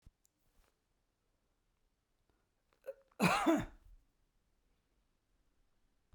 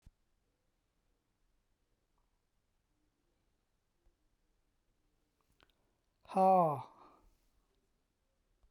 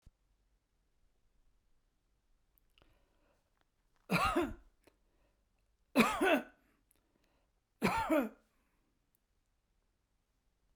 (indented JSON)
{
  "cough_length": "6.1 s",
  "cough_amplitude": 3913,
  "cough_signal_mean_std_ratio": 0.23,
  "exhalation_length": "8.7 s",
  "exhalation_amplitude": 3773,
  "exhalation_signal_mean_std_ratio": 0.19,
  "three_cough_length": "10.8 s",
  "three_cough_amplitude": 7335,
  "three_cough_signal_mean_std_ratio": 0.28,
  "survey_phase": "beta (2021-08-13 to 2022-03-07)",
  "age": "65+",
  "gender": "Male",
  "wearing_mask": "No",
  "symptom_none": true,
  "smoker_status": "Ex-smoker",
  "respiratory_condition_asthma": false,
  "respiratory_condition_other": false,
  "recruitment_source": "REACT",
  "submission_delay": "2 days",
  "covid_test_result": "Negative",
  "covid_test_method": "RT-qPCR"
}